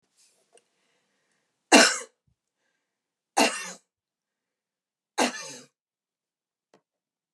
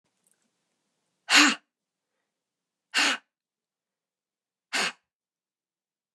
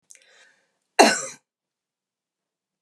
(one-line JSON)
{"three_cough_length": "7.3 s", "three_cough_amplitude": 31380, "three_cough_signal_mean_std_ratio": 0.21, "exhalation_length": "6.1 s", "exhalation_amplitude": 21526, "exhalation_signal_mean_std_ratio": 0.23, "cough_length": "2.8 s", "cough_amplitude": 31812, "cough_signal_mean_std_ratio": 0.2, "survey_phase": "beta (2021-08-13 to 2022-03-07)", "age": "65+", "gender": "Female", "wearing_mask": "No", "symptom_none": true, "smoker_status": "Never smoked", "respiratory_condition_asthma": false, "respiratory_condition_other": false, "recruitment_source": "REACT", "submission_delay": "1 day", "covid_test_result": "Negative", "covid_test_method": "RT-qPCR"}